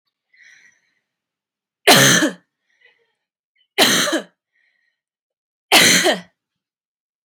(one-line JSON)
{"three_cough_length": "7.2 s", "three_cough_amplitude": 32768, "three_cough_signal_mean_std_ratio": 0.34, "survey_phase": "beta (2021-08-13 to 2022-03-07)", "age": "18-44", "gender": "Female", "wearing_mask": "No", "symptom_none": true, "smoker_status": "Never smoked", "respiratory_condition_asthma": false, "respiratory_condition_other": false, "recruitment_source": "REACT", "submission_delay": "2 days", "covid_test_result": "Negative", "covid_test_method": "RT-qPCR"}